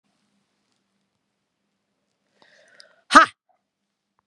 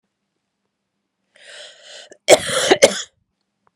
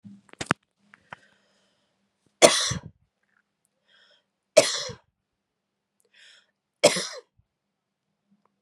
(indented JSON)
{
  "exhalation_length": "4.3 s",
  "exhalation_amplitude": 32768,
  "exhalation_signal_mean_std_ratio": 0.13,
  "cough_length": "3.8 s",
  "cough_amplitude": 32768,
  "cough_signal_mean_std_ratio": 0.27,
  "three_cough_length": "8.6 s",
  "three_cough_amplitude": 32767,
  "three_cough_signal_mean_std_ratio": 0.2,
  "survey_phase": "beta (2021-08-13 to 2022-03-07)",
  "age": "45-64",
  "gender": "Female",
  "wearing_mask": "No",
  "symptom_runny_or_blocked_nose": true,
  "symptom_fatigue": true,
  "symptom_headache": true,
  "symptom_onset": "4 days",
  "smoker_status": "Never smoked",
  "respiratory_condition_asthma": false,
  "respiratory_condition_other": false,
  "recruitment_source": "Test and Trace",
  "submission_delay": "1 day",
  "covid_test_result": "Positive",
  "covid_test_method": "RT-qPCR",
  "covid_ct_value": 20.8,
  "covid_ct_gene": "ORF1ab gene",
  "covid_ct_mean": 21.4,
  "covid_viral_load": "97000 copies/ml",
  "covid_viral_load_category": "Low viral load (10K-1M copies/ml)"
}